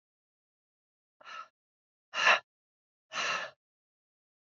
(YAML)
exhalation_length: 4.4 s
exhalation_amplitude: 9903
exhalation_signal_mean_std_ratio: 0.26
survey_phase: beta (2021-08-13 to 2022-03-07)
age: 18-44
gender: Female
wearing_mask: 'No'
symptom_new_continuous_cough: true
symptom_runny_or_blocked_nose: true
symptom_diarrhoea: true
symptom_fatigue: true
symptom_headache: true
symptom_onset: 4 days
smoker_status: Never smoked
respiratory_condition_asthma: true
respiratory_condition_other: false
recruitment_source: Test and Trace
submission_delay: 2 days
covid_test_result: Positive
covid_test_method: RT-qPCR
covid_ct_value: 21.1
covid_ct_gene: ORF1ab gene
covid_ct_mean: 21.5
covid_viral_load: 91000 copies/ml
covid_viral_load_category: Low viral load (10K-1M copies/ml)